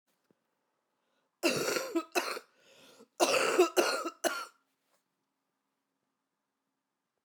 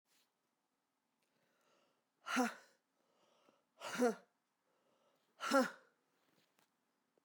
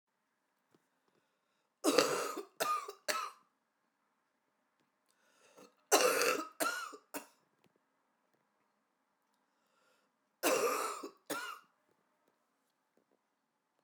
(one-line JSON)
{"cough_length": "7.2 s", "cough_amplitude": 8135, "cough_signal_mean_std_ratio": 0.37, "exhalation_length": "7.2 s", "exhalation_amplitude": 3524, "exhalation_signal_mean_std_ratio": 0.24, "three_cough_length": "13.8 s", "three_cough_amplitude": 13186, "three_cough_signal_mean_std_ratio": 0.33, "survey_phase": "beta (2021-08-13 to 2022-03-07)", "age": "45-64", "gender": "Female", "wearing_mask": "No", "symptom_cough_any": true, "symptom_runny_or_blocked_nose": true, "symptom_sore_throat": true, "symptom_fatigue": true, "symptom_headache": true, "symptom_change_to_sense_of_smell_or_taste": true, "symptom_onset": "6 days", "smoker_status": "Never smoked", "respiratory_condition_asthma": false, "respiratory_condition_other": false, "recruitment_source": "Test and Trace", "submission_delay": "2 days", "covid_test_result": "Positive", "covid_test_method": "RT-qPCR"}